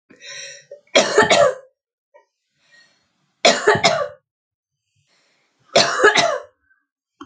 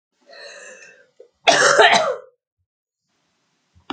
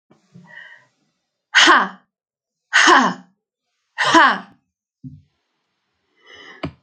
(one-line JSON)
{"three_cough_length": "7.3 s", "three_cough_amplitude": 32768, "three_cough_signal_mean_std_ratio": 0.38, "cough_length": "3.9 s", "cough_amplitude": 29416, "cough_signal_mean_std_ratio": 0.35, "exhalation_length": "6.8 s", "exhalation_amplitude": 32021, "exhalation_signal_mean_std_ratio": 0.33, "survey_phase": "alpha (2021-03-01 to 2021-08-12)", "age": "45-64", "gender": "Female", "wearing_mask": "No", "symptom_headache": true, "symptom_change_to_sense_of_smell_or_taste": true, "symptom_loss_of_taste": true, "smoker_status": "Never smoked", "respiratory_condition_asthma": true, "respiratory_condition_other": false, "recruitment_source": "Test and Trace", "submission_delay": "1 day", "covid_test_result": "Positive", "covid_test_method": "RT-qPCR"}